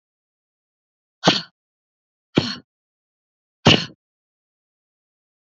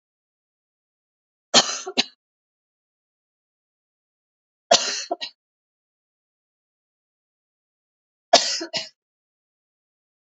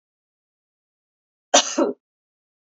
{"exhalation_length": "5.5 s", "exhalation_amplitude": 29390, "exhalation_signal_mean_std_ratio": 0.2, "three_cough_length": "10.3 s", "three_cough_amplitude": 30547, "three_cough_signal_mean_std_ratio": 0.2, "cough_length": "2.6 s", "cough_amplitude": 28786, "cough_signal_mean_std_ratio": 0.24, "survey_phase": "beta (2021-08-13 to 2022-03-07)", "age": "45-64", "gender": "Female", "wearing_mask": "No", "symptom_cough_any": true, "symptom_new_continuous_cough": true, "symptom_runny_or_blocked_nose": true, "symptom_shortness_of_breath": true, "symptom_fatigue": true, "symptom_headache": true, "symptom_change_to_sense_of_smell_or_taste": true, "symptom_loss_of_taste": true, "symptom_other": true, "smoker_status": "Ex-smoker", "respiratory_condition_asthma": false, "respiratory_condition_other": false, "recruitment_source": "Test and Trace", "submission_delay": "-1 day", "covid_test_result": "Positive", "covid_test_method": "LFT"}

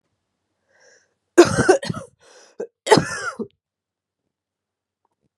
{"cough_length": "5.4 s", "cough_amplitude": 32768, "cough_signal_mean_std_ratio": 0.26, "survey_phase": "beta (2021-08-13 to 2022-03-07)", "age": "18-44", "gender": "Female", "wearing_mask": "No", "symptom_cough_any": true, "symptom_runny_or_blocked_nose": true, "symptom_shortness_of_breath": true, "symptom_sore_throat": true, "symptom_abdominal_pain": true, "symptom_fatigue": true, "symptom_fever_high_temperature": true, "symptom_headache": true, "symptom_other": true, "symptom_onset": "3 days", "smoker_status": "Current smoker (1 to 10 cigarettes per day)", "respiratory_condition_asthma": false, "respiratory_condition_other": false, "recruitment_source": "Test and Trace", "submission_delay": "1 day", "covid_test_result": "Positive", "covid_test_method": "RT-qPCR", "covid_ct_value": 19.7, "covid_ct_gene": "ORF1ab gene", "covid_ct_mean": 20.2, "covid_viral_load": "230000 copies/ml", "covid_viral_load_category": "Low viral load (10K-1M copies/ml)"}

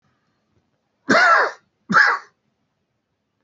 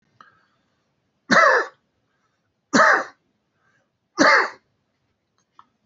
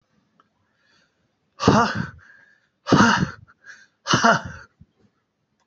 {"cough_length": "3.4 s", "cough_amplitude": 26671, "cough_signal_mean_std_ratio": 0.37, "three_cough_length": "5.9 s", "three_cough_amplitude": 26481, "three_cough_signal_mean_std_ratio": 0.32, "exhalation_length": "5.7 s", "exhalation_amplitude": 27119, "exhalation_signal_mean_std_ratio": 0.35, "survey_phase": "alpha (2021-03-01 to 2021-08-12)", "age": "45-64", "gender": "Male", "wearing_mask": "No", "symptom_none": true, "smoker_status": "Never smoked", "respiratory_condition_asthma": true, "respiratory_condition_other": false, "recruitment_source": "REACT", "submission_delay": "4 days", "covid_test_result": "Negative", "covid_test_method": "RT-qPCR"}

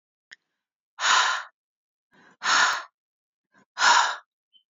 {"exhalation_length": "4.7 s", "exhalation_amplitude": 18489, "exhalation_signal_mean_std_ratio": 0.39, "survey_phase": "beta (2021-08-13 to 2022-03-07)", "age": "45-64", "gender": "Female", "wearing_mask": "No", "symptom_headache": true, "smoker_status": "Never smoked", "respiratory_condition_asthma": false, "respiratory_condition_other": false, "recruitment_source": "REACT", "submission_delay": "3 days", "covid_test_result": "Negative", "covid_test_method": "RT-qPCR", "influenza_a_test_result": "Negative", "influenza_b_test_result": "Negative"}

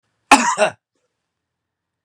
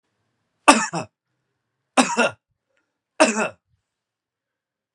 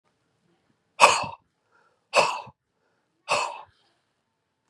{"cough_length": "2.0 s", "cough_amplitude": 32768, "cough_signal_mean_std_ratio": 0.29, "three_cough_length": "4.9 s", "three_cough_amplitude": 32767, "three_cough_signal_mean_std_ratio": 0.27, "exhalation_length": "4.7 s", "exhalation_amplitude": 31649, "exhalation_signal_mean_std_ratio": 0.27, "survey_phase": "beta (2021-08-13 to 2022-03-07)", "age": "45-64", "gender": "Male", "wearing_mask": "No", "symptom_cough_any": true, "symptom_onset": "5 days", "smoker_status": "Ex-smoker", "respiratory_condition_asthma": false, "respiratory_condition_other": false, "recruitment_source": "Test and Trace", "submission_delay": "1 day", "covid_test_result": "Positive", "covid_test_method": "RT-qPCR", "covid_ct_value": 15.0, "covid_ct_gene": "ORF1ab gene", "covid_ct_mean": 15.2, "covid_viral_load": "10000000 copies/ml", "covid_viral_load_category": "High viral load (>1M copies/ml)"}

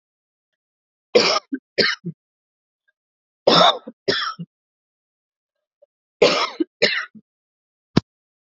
{"three_cough_length": "8.5 s", "three_cough_amplitude": 32768, "three_cough_signal_mean_std_ratio": 0.31, "survey_phase": "beta (2021-08-13 to 2022-03-07)", "age": "18-44", "gender": "Female", "wearing_mask": "No", "symptom_cough_any": true, "symptom_runny_or_blocked_nose": true, "symptom_sore_throat": true, "symptom_abdominal_pain": true, "symptom_fatigue": true, "symptom_fever_high_temperature": true, "symptom_headache": true, "symptom_onset": "2 days", "smoker_status": "Never smoked", "respiratory_condition_asthma": false, "respiratory_condition_other": false, "recruitment_source": "Test and Trace", "submission_delay": "1 day", "covid_test_result": "Positive", "covid_test_method": "RT-qPCR", "covid_ct_value": 24.1, "covid_ct_gene": "ORF1ab gene", "covid_ct_mean": 24.1, "covid_viral_load": "13000 copies/ml", "covid_viral_load_category": "Low viral load (10K-1M copies/ml)"}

